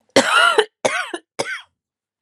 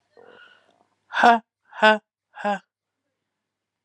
{"cough_length": "2.2 s", "cough_amplitude": 32767, "cough_signal_mean_std_ratio": 0.47, "exhalation_length": "3.8 s", "exhalation_amplitude": 29106, "exhalation_signal_mean_std_ratio": 0.27, "survey_phase": "alpha (2021-03-01 to 2021-08-12)", "age": "18-44", "gender": "Female", "wearing_mask": "No", "symptom_diarrhoea": true, "symptom_fatigue": true, "symptom_fever_high_temperature": true, "symptom_headache": true, "symptom_change_to_sense_of_smell_or_taste": true, "symptom_onset": "5 days", "smoker_status": "Never smoked", "respiratory_condition_asthma": false, "respiratory_condition_other": false, "recruitment_source": "Test and Trace", "submission_delay": "2 days", "covid_test_result": "Positive", "covid_test_method": "RT-qPCR", "covid_ct_value": 23.3, "covid_ct_gene": "ORF1ab gene", "covid_ct_mean": 23.4, "covid_viral_load": "21000 copies/ml", "covid_viral_load_category": "Low viral load (10K-1M copies/ml)"}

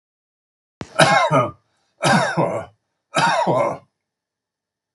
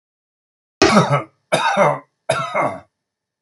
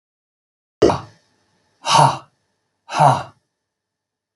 {"three_cough_length": "4.9 s", "three_cough_amplitude": 32768, "three_cough_signal_mean_std_ratio": 0.48, "cough_length": "3.4 s", "cough_amplitude": 32768, "cough_signal_mean_std_ratio": 0.49, "exhalation_length": "4.4 s", "exhalation_amplitude": 32766, "exhalation_signal_mean_std_ratio": 0.32, "survey_phase": "beta (2021-08-13 to 2022-03-07)", "age": "65+", "gender": "Male", "wearing_mask": "No", "symptom_none": true, "smoker_status": "Never smoked", "respiratory_condition_asthma": false, "respiratory_condition_other": false, "recruitment_source": "REACT", "submission_delay": "1 day", "covid_test_result": "Negative", "covid_test_method": "RT-qPCR", "influenza_a_test_result": "Negative", "influenza_b_test_result": "Negative"}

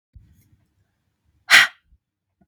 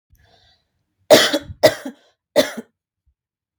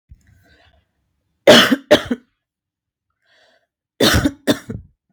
{"exhalation_length": "2.5 s", "exhalation_amplitude": 32768, "exhalation_signal_mean_std_ratio": 0.2, "three_cough_length": "3.6 s", "three_cough_amplitude": 32768, "three_cough_signal_mean_std_ratio": 0.28, "cough_length": "5.1 s", "cough_amplitude": 32768, "cough_signal_mean_std_ratio": 0.31, "survey_phase": "beta (2021-08-13 to 2022-03-07)", "age": "18-44", "gender": "Female", "wearing_mask": "No", "symptom_cough_any": true, "smoker_status": "Current smoker (1 to 10 cigarettes per day)", "respiratory_condition_asthma": false, "respiratory_condition_other": false, "recruitment_source": "REACT", "submission_delay": "2 days", "covid_test_result": "Negative", "covid_test_method": "RT-qPCR", "influenza_a_test_result": "Unknown/Void", "influenza_b_test_result": "Unknown/Void"}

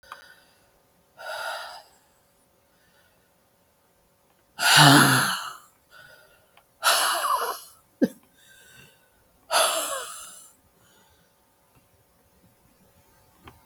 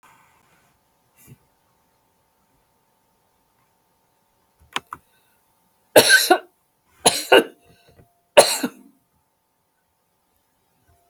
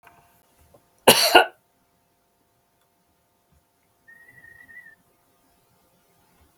{"exhalation_length": "13.7 s", "exhalation_amplitude": 32768, "exhalation_signal_mean_std_ratio": 0.31, "three_cough_length": "11.1 s", "three_cough_amplitude": 32768, "three_cough_signal_mean_std_ratio": 0.21, "cough_length": "6.6 s", "cough_amplitude": 32768, "cough_signal_mean_std_ratio": 0.18, "survey_phase": "beta (2021-08-13 to 2022-03-07)", "age": "65+", "gender": "Female", "wearing_mask": "No", "symptom_runny_or_blocked_nose": true, "smoker_status": "Never smoked", "respiratory_condition_asthma": false, "respiratory_condition_other": false, "recruitment_source": "REACT", "submission_delay": "2 days", "covid_test_result": "Negative", "covid_test_method": "RT-qPCR", "influenza_a_test_result": "Negative", "influenza_b_test_result": "Negative"}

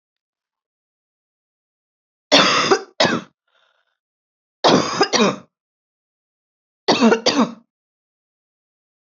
{"three_cough_length": "9.0 s", "three_cough_amplitude": 32767, "three_cough_signal_mean_std_ratio": 0.35, "survey_phase": "beta (2021-08-13 to 2022-03-07)", "age": "18-44", "gender": "Female", "wearing_mask": "No", "symptom_cough_any": true, "symptom_sore_throat": true, "symptom_fatigue": true, "symptom_onset": "1 day", "smoker_status": "Never smoked", "respiratory_condition_asthma": false, "respiratory_condition_other": false, "recruitment_source": "Test and Trace", "submission_delay": "0 days", "covid_test_result": "Negative", "covid_test_method": "RT-qPCR"}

